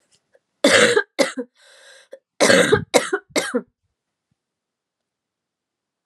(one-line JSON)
{"cough_length": "6.1 s", "cough_amplitude": 32768, "cough_signal_mean_std_ratio": 0.36, "survey_phase": "alpha (2021-03-01 to 2021-08-12)", "age": "18-44", "gender": "Female", "wearing_mask": "No", "symptom_cough_any": true, "symptom_fatigue": true, "smoker_status": "Prefer not to say", "respiratory_condition_asthma": false, "respiratory_condition_other": false, "recruitment_source": "Test and Trace", "submission_delay": "2 days", "covid_test_result": "Positive", "covid_test_method": "RT-qPCR", "covid_ct_value": 23.6, "covid_ct_gene": "ORF1ab gene", "covid_ct_mean": 24.1, "covid_viral_load": "12000 copies/ml", "covid_viral_load_category": "Low viral load (10K-1M copies/ml)"}